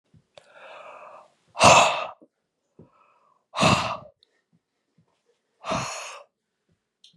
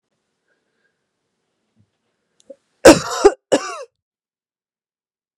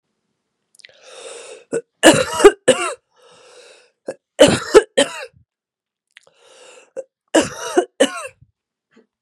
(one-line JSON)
{"exhalation_length": "7.2 s", "exhalation_amplitude": 30809, "exhalation_signal_mean_std_ratio": 0.29, "cough_length": "5.4 s", "cough_amplitude": 32768, "cough_signal_mean_std_ratio": 0.2, "three_cough_length": "9.2 s", "three_cough_amplitude": 32768, "three_cough_signal_mean_std_ratio": 0.3, "survey_phase": "beta (2021-08-13 to 2022-03-07)", "age": "18-44", "gender": "Female", "wearing_mask": "No", "symptom_runny_or_blocked_nose": true, "symptom_diarrhoea": true, "symptom_fatigue": true, "symptom_fever_high_temperature": true, "symptom_headache": true, "smoker_status": "Ex-smoker", "respiratory_condition_asthma": false, "respiratory_condition_other": false, "recruitment_source": "Test and Trace", "submission_delay": "2 days", "covid_test_result": "Positive", "covid_test_method": "LFT"}